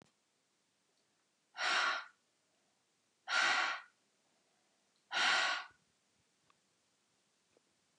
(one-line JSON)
{"exhalation_length": "8.0 s", "exhalation_amplitude": 3568, "exhalation_signal_mean_std_ratio": 0.35, "survey_phase": "beta (2021-08-13 to 2022-03-07)", "age": "45-64", "gender": "Female", "wearing_mask": "No", "symptom_none": true, "smoker_status": "Never smoked", "respiratory_condition_asthma": false, "respiratory_condition_other": false, "recruitment_source": "REACT", "submission_delay": "1 day", "covid_test_result": "Negative", "covid_test_method": "RT-qPCR", "influenza_a_test_result": "Negative", "influenza_b_test_result": "Negative"}